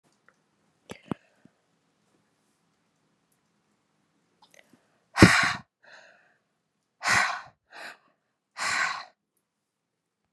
{"exhalation_length": "10.3 s", "exhalation_amplitude": 32361, "exhalation_signal_mean_std_ratio": 0.22, "survey_phase": "beta (2021-08-13 to 2022-03-07)", "age": "45-64", "gender": "Female", "wearing_mask": "No", "symptom_cough_any": true, "symptom_runny_or_blocked_nose": true, "symptom_sore_throat": true, "symptom_fatigue": true, "symptom_fever_high_temperature": true, "symptom_headache": true, "symptom_change_to_sense_of_smell_or_taste": true, "symptom_loss_of_taste": true, "symptom_other": true, "symptom_onset": "2 days", "smoker_status": "Never smoked", "respiratory_condition_asthma": false, "respiratory_condition_other": false, "recruitment_source": "Test and Trace", "submission_delay": "2 days", "covid_test_method": "RT-qPCR", "covid_ct_value": 26.7, "covid_ct_gene": "ORF1ab gene"}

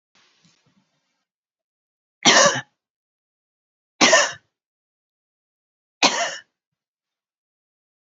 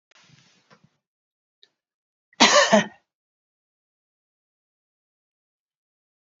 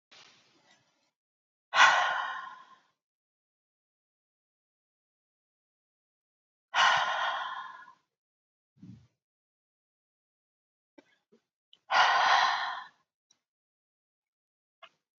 {"three_cough_length": "8.1 s", "three_cough_amplitude": 32767, "three_cough_signal_mean_std_ratio": 0.25, "cough_length": "6.4 s", "cough_amplitude": 28453, "cough_signal_mean_std_ratio": 0.2, "exhalation_length": "15.2 s", "exhalation_amplitude": 15736, "exhalation_signal_mean_std_ratio": 0.29, "survey_phase": "beta (2021-08-13 to 2022-03-07)", "age": "65+", "gender": "Female", "wearing_mask": "No", "symptom_none": true, "smoker_status": "Never smoked", "respiratory_condition_asthma": false, "respiratory_condition_other": false, "recruitment_source": "REACT", "submission_delay": "3 days", "covid_test_result": "Negative", "covid_test_method": "RT-qPCR", "influenza_a_test_result": "Negative", "influenza_b_test_result": "Negative"}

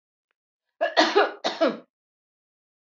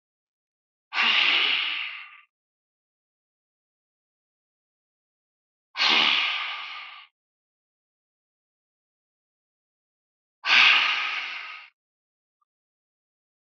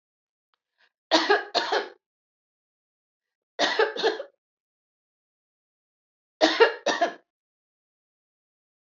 {"cough_length": "3.0 s", "cough_amplitude": 20064, "cough_signal_mean_std_ratio": 0.36, "exhalation_length": "13.6 s", "exhalation_amplitude": 19833, "exhalation_signal_mean_std_ratio": 0.34, "three_cough_length": "9.0 s", "three_cough_amplitude": 20966, "three_cough_signal_mean_std_ratio": 0.31, "survey_phase": "beta (2021-08-13 to 2022-03-07)", "age": "45-64", "gender": "Female", "wearing_mask": "No", "symptom_runny_or_blocked_nose": true, "symptom_fatigue": true, "symptom_onset": "12 days", "smoker_status": "Never smoked", "respiratory_condition_asthma": false, "respiratory_condition_other": false, "recruitment_source": "REACT", "submission_delay": "2 days", "covid_test_result": "Negative", "covid_test_method": "RT-qPCR", "influenza_a_test_result": "Negative", "influenza_b_test_result": "Negative"}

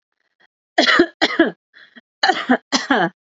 {"cough_length": "3.2 s", "cough_amplitude": 31776, "cough_signal_mean_std_ratio": 0.46, "survey_phase": "beta (2021-08-13 to 2022-03-07)", "age": "18-44", "gender": "Female", "wearing_mask": "No", "symptom_none": true, "smoker_status": "Never smoked", "respiratory_condition_asthma": false, "respiratory_condition_other": false, "recruitment_source": "REACT", "submission_delay": "3 days", "covid_test_result": "Negative", "covid_test_method": "RT-qPCR", "influenza_a_test_result": "Negative", "influenza_b_test_result": "Negative"}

